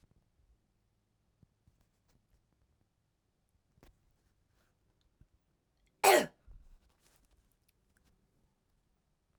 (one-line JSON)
{"cough_length": "9.4 s", "cough_amplitude": 9444, "cough_signal_mean_std_ratio": 0.13, "survey_phase": "beta (2021-08-13 to 2022-03-07)", "age": "18-44", "gender": "Female", "wearing_mask": "No", "symptom_runny_or_blocked_nose": true, "symptom_fatigue": true, "symptom_fever_high_temperature": true, "symptom_headache": true, "smoker_status": "Never smoked", "respiratory_condition_asthma": false, "respiratory_condition_other": false, "recruitment_source": "Test and Trace", "submission_delay": "2 days", "covid_test_result": "Positive", "covid_test_method": "RT-qPCR", "covid_ct_value": 24.0, "covid_ct_gene": "ORF1ab gene"}